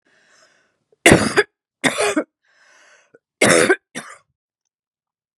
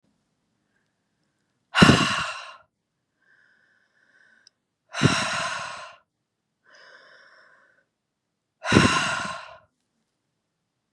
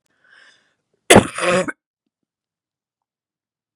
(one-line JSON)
{"three_cough_length": "5.4 s", "three_cough_amplitude": 32768, "three_cough_signal_mean_std_ratio": 0.33, "exhalation_length": "10.9 s", "exhalation_amplitude": 32517, "exhalation_signal_mean_std_ratio": 0.29, "cough_length": "3.8 s", "cough_amplitude": 32768, "cough_signal_mean_std_ratio": 0.23, "survey_phase": "beta (2021-08-13 to 2022-03-07)", "age": "45-64", "gender": "Female", "wearing_mask": "No", "symptom_cough_any": true, "symptom_runny_or_blocked_nose": true, "symptom_onset": "12 days", "smoker_status": "Current smoker (11 or more cigarettes per day)", "respiratory_condition_asthma": false, "respiratory_condition_other": false, "recruitment_source": "REACT", "submission_delay": "1 day", "covid_test_result": "Negative", "covid_test_method": "RT-qPCR", "influenza_a_test_result": "Negative", "influenza_b_test_result": "Negative"}